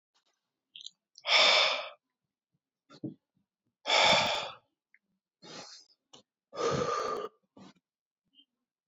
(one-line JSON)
{"exhalation_length": "8.9 s", "exhalation_amplitude": 10091, "exhalation_signal_mean_std_ratio": 0.37, "survey_phase": "beta (2021-08-13 to 2022-03-07)", "age": "65+", "gender": "Male", "wearing_mask": "No", "symptom_none": true, "smoker_status": "Ex-smoker", "respiratory_condition_asthma": false, "respiratory_condition_other": false, "recruitment_source": "REACT", "submission_delay": "2 days", "covid_test_result": "Negative", "covid_test_method": "RT-qPCR"}